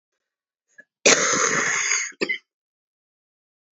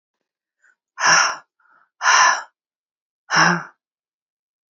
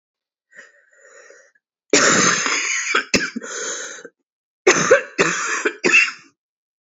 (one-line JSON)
{"cough_length": "3.8 s", "cough_amplitude": 30491, "cough_signal_mean_std_ratio": 0.43, "exhalation_length": "4.7 s", "exhalation_amplitude": 27599, "exhalation_signal_mean_std_ratio": 0.37, "three_cough_length": "6.8 s", "three_cough_amplitude": 30866, "three_cough_signal_mean_std_ratio": 0.49, "survey_phase": "beta (2021-08-13 to 2022-03-07)", "age": "18-44", "gender": "Female", "wearing_mask": "No", "symptom_cough_any": true, "symptom_runny_or_blocked_nose": true, "symptom_fatigue": true, "symptom_change_to_sense_of_smell_or_taste": true, "symptom_loss_of_taste": true, "symptom_onset": "5 days", "smoker_status": "Never smoked", "respiratory_condition_asthma": false, "respiratory_condition_other": false, "recruitment_source": "Test and Trace", "submission_delay": "2 days", "covid_test_result": "Positive", "covid_test_method": "RT-qPCR", "covid_ct_value": 14.8, "covid_ct_gene": "ORF1ab gene", "covid_ct_mean": 15.1, "covid_viral_load": "11000000 copies/ml", "covid_viral_load_category": "High viral load (>1M copies/ml)"}